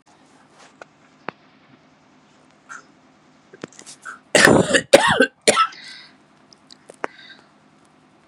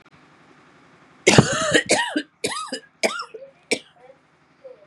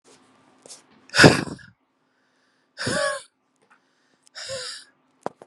{"cough_length": "8.3 s", "cough_amplitude": 32768, "cough_signal_mean_std_ratio": 0.28, "three_cough_length": "4.9 s", "three_cough_amplitude": 32768, "three_cough_signal_mean_std_ratio": 0.37, "exhalation_length": "5.5 s", "exhalation_amplitude": 32768, "exhalation_signal_mean_std_ratio": 0.25, "survey_phase": "beta (2021-08-13 to 2022-03-07)", "age": "18-44", "gender": "Female", "wearing_mask": "No", "symptom_cough_any": true, "symptom_new_continuous_cough": true, "symptom_runny_or_blocked_nose": true, "symptom_shortness_of_breath": true, "symptom_sore_throat": true, "symptom_fatigue": true, "symptom_change_to_sense_of_smell_or_taste": true, "symptom_loss_of_taste": true, "symptom_onset": "4 days", "smoker_status": "Ex-smoker", "respiratory_condition_asthma": false, "respiratory_condition_other": false, "recruitment_source": "Test and Trace", "submission_delay": "1 day", "covid_test_result": "Positive", "covid_test_method": "RT-qPCR", "covid_ct_value": 26.8, "covid_ct_gene": "ORF1ab gene", "covid_ct_mean": 27.4, "covid_viral_load": "1100 copies/ml", "covid_viral_load_category": "Minimal viral load (< 10K copies/ml)"}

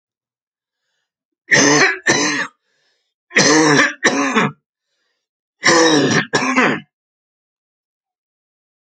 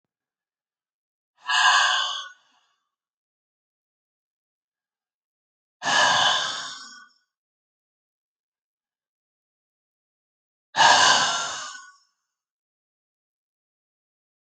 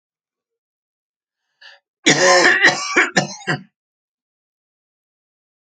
{"three_cough_length": "8.9 s", "three_cough_amplitude": 32768, "three_cough_signal_mean_std_ratio": 0.48, "exhalation_length": "14.4 s", "exhalation_amplitude": 22549, "exhalation_signal_mean_std_ratio": 0.31, "cough_length": "5.7 s", "cough_amplitude": 32767, "cough_signal_mean_std_ratio": 0.35, "survey_phase": "alpha (2021-03-01 to 2021-08-12)", "age": "45-64", "gender": "Male", "wearing_mask": "No", "symptom_none": true, "smoker_status": "Ex-smoker", "respiratory_condition_asthma": false, "respiratory_condition_other": false, "recruitment_source": "REACT", "submission_delay": "3 days", "covid_test_result": "Negative", "covid_test_method": "RT-qPCR"}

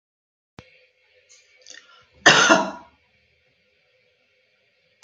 {"cough_length": "5.0 s", "cough_amplitude": 32767, "cough_signal_mean_std_ratio": 0.23, "survey_phase": "beta (2021-08-13 to 2022-03-07)", "age": "65+", "gender": "Female", "wearing_mask": "No", "symptom_none": true, "smoker_status": "Never smoked", "respiratory_condition_asthma": false, "respiratory_condition_other": false, "recruitment_source": "REACT", "submission_delay": "1 day", "covid_test_result": "Negative", "covid_test_method": "RT-qPCR", "influenza_a_test_result": "Negative", "influenza_b_test_result": "Negative"}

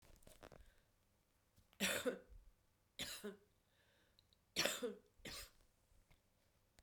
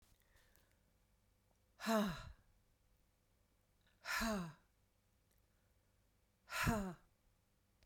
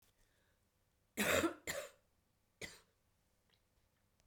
{"three_cough_length": "6.8 s", "three_cough_amplitude": 3590, "three_cough_signal_mean_std_ratio": 0.35, "exhalation_length": "7.9 s", "exhalation_amplitude": 2076, "exhalation_signal_mean_std_ratio": 0.34, "cough_length": "4.3 s", "cough_amplitude": 3003, "cough_signal_mean_std_ratio": 0.29, "survey_phase": "beta (2021-08-13 to 2022-03-07)", "age": "65+", "gender": "Male", "wearing_mask": "No", "symptom_cough_any": true, "symptom_runny_or_blocked_nose": true, "symptom_change_to_sense_of_smell_or_taste": true, "symptom_loss_of_taste": true, "symptom_onset": "6 days", "smoker_status": "Never smoked", "respiratory_condition_asthma": false, "respiratory_condition_other": false, "recruitment_source": "Test and Trace", "submission_delay": "1 day", "covid_test_result": "Negative", "covid_test_method": "RT-qPCR"}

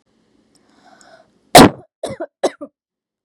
{"cough_length": "3.2 s", "cough_amplitude": 32768, "cough_signal_mean_std_ratio": 0.22, "survey_phase": "beta (2021-08-13 to 2022-03-07)", "age": "18-44", "gender": "Female", "wearing_mask": "No", "symptom_none": true, "smoker_status": "Never smoked", "respiratory_condition_asthma": false, "respiratory_condition_other": false, "recruitment_source": "REACT", "submission_delay": "3 days", "covid_test_result": "Negative", "covid_test_method": "RT-qPCR", "influenza_a_test_result": "Negative", "influenza_b_test_result": "Negative"}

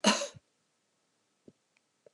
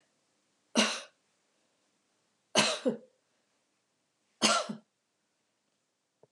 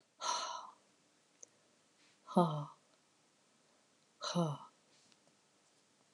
{"cough_length": "2.1 s", "cough_amplitude": 9113, "cough_signal_mean_std_ratio": 0.24, "three_cough_length": "6.3 s", "three_cough_amplitude": 10022, "three_cough_signal_mean_std_ratio": 0.28, "exhalation_length": "6.1 s", "exhalation_amplitude": 5049, "exhalation_signal_mean_std_ratio": 0.32, "survey_phase": "beta (2021-08-13 to 2022-03-07)", "age": "45-64", "gender": "Female", "wearing_mask": "No", "symptom_cough_any": true, "symptom_runny_or_blocked_nose": true, "symptom_sore_throat": true, "symptom_fever_high_temperature": true, "symptom_headache": true, "symptom_other": true, "smoker_status": "Never smoked", "respiratory_condition_asthma": false, "respiratory_condition_other": false, "recruitment_source": "Test and Trace", "submission_delay": "1 day", "covid_test_result": "Positive", "covid_test_method": "RT-qPCR", "covid_ct_value": 23.6, "covid_ct_gene": "N gene"}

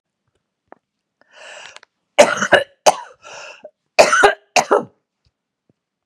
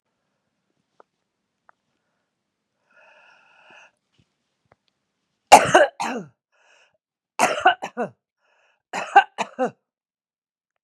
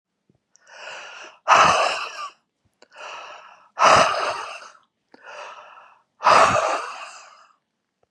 {"cough_length": "6.1 s", "cough_amplitude": 32768, "cough_signal_mean_std_ratio": 0.3, "three_cough_length": "10.8 s", "three_cough_amplitude": 32768, "three_cough_signal_mean_std_ratio": 0.21, "exhalation_length": "8.1 s", "exhalation_amplitude": 29078, "exhalation_signal_mean_std_ratio": 0.4, "survey_phase": "beta (2021-08-13 to 2022-03-07)", "age": "65+", "gender": "Female", "wearing_mask": "No", "symptom_none": true, "smoker_status": "Never smoked", "respiratory_condition_asthma": false, "respiratory_condition_other": false, "recruitment_source": "REACT", "submission_delay": "2 days", "covid_test_result": "Negative", "covid_test_method": "RT-qPCR", "influenza_a_test_result": "Negative", "influenza_b_test_result": "Negative"}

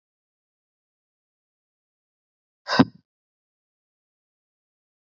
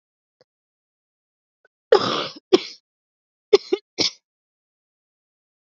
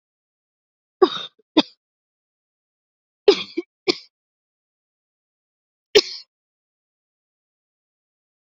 {"exhalation_length": "5.0 s", "exhalation_amplitude": 26327, "exhalation_signal_mean_std_ratio": 0.11, "cough_length": "5.6 s", "cough_amplitude": 28989, "cough_signal_mean_std_ratio": 0.21, "three_cough_length": "8.4 s", "three_cough_amplitude": 29838, "three_cough_signal_mean_std_ratio": 0.17, "survey_phase": "beta (2021-08-13 to 2022-03-07)", "age": "18-44", "gender": "Female", "wearing_mask": "No", "symptom_cough_any": true, "symptom_runny_or_blocked_nose": true, "symptom_shortness_of_breath": true, "symptom_fatigue": true, "symptom_fever_high_temperature": true, "symptom_headache": true, "symptom_change_to_sense_of_smell_or_taste": true, "symptom_loss_of_taste": true, "symptom_onset": "4 days", "smoker_status": "Current smoker (e-cigarettes or vapes only)", "respiratory_condition_asthma": false, "respiratory_condition_other": false, "recruitment_source": "Test and Trace", "submission_delay": "1 day", "covid_test_result": "Positive", "covid_test_method": "RT-qPCR", "covid_ct_value": 21.2, "covid_ct_gene": "ORF1ab gene"}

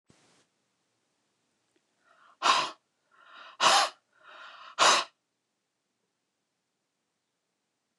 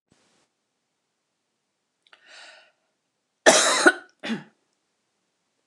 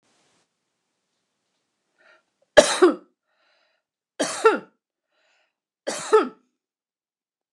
{"exhalation_length": "8.0 s", "exhalation_amplitude": 13911, "exhalation_signal_mean_std_ratio": 0.26, "cough_length": "5.7 s", "cough_amplitude": 29154, "cough_signal_mean_std_ratio": 0.23, "three_cough_length": "7.5 s", "three_cough_amplitude": 29204, "three_cough_signal_mean_std_ratio": 0.23, "survey_phase": "alpha (2021-03-01 to 2021-08-12)", "age": "65+", "gender": "Female", "wearing_mask": "No", "symptom_none": true, "smoker_status": "Never smoked", "respiratory_condition_asthma": false, "respiratory_condition_other": false, "recruitment_source": "REACT", "submission_delay": "1 day", "covid_test_result": "Negative", "covid_test_method": "RT-qPCR"}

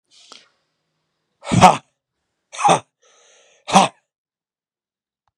{"exhalation_length": "5.4 s", "exhalation_amplitude": 32768, "exhalation_signal_mean_std_ratio": 0.25, "survey_phase": "beta (2021-08-13 to 2022-03-07)", "age": "18-44", "gender": "Male", "wearing_mask": "No", "symptom_none": true, "smoker_status": "Ex-smoker", "respiratory_condition_asthma": false, "respiratory_condition_other": false, "recruitment_source": "REACT", "submission_delay": "1 day", "covid_test_result": "Negative", "covid_test_method": "RT-qPCR", "influenza_a_test_result": "Negative", "influenza_b_test_result": "Negative"}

